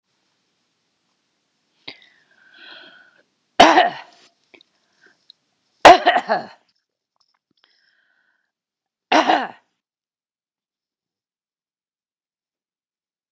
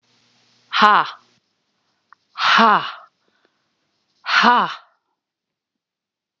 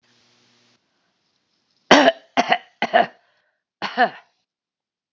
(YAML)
three_cough_length: 13.3 s
three_cough_amplitude: 32768
three_cough_signal_mean_std_ratio: 0.2
exhalation_length: 6.4 s
exhalation_amplitude: 32768
exhalation_signal_mean_std_ratio: 0.32
cough_length: 5.1 s
cough_amplitude: 32768
cough_signal_mean_std_ratio: 0.27
survey_phase: beta (2021-08-13 to 2022-03-07)
age: 65+
gender: Female
wearing_mask: 'No'
symptom_none: true
smoker_status: Never smoked
respiratory_condition_asthma: false
respiratory_condition_other: false
recruitment_source: REACT
submission_delay: 2 days
covid_test_result: Negative
covid_test_method: RT-qPCR
influenza_a_test_result: Negative
influenza_b_test_result: Negative